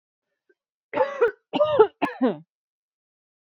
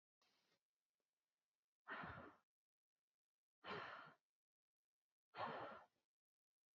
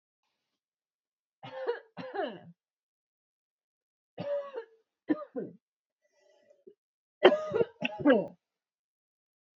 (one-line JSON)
{"cough_length": "3.4 s", "cough_amplitude": 24020, "cough_signal_mean_std_ratio": 0.38, "exhalation_length": "6.7 s", "exhalation_amplitude": 466, "exhalation_signal_mean_std_ratio": 0.35, "three_cough_length": "9.6 s", "three_cough_amplitude": 17367, "three_cough_signal_mean_std_ratio": 0.28, "survey_phase": "beta (2021-08-13 to 2022-03-07)", "age": "18-44", "gender": "Female", "wearing_mask": "No", "symptom_none": true, "symptom_onset": "13 days", "smoker_status": "Never smoked", "respiratory_condition_asthma": false, "respiratory_condition_other": false, "recruitment_source": "REACT", "submission_delay": "11 days", "covid_test_result": "Negative", "covid_test_method": "RT-qPCR", "influenza_a_test_result": "Negative", "influenza_b_test_result": "Negative"}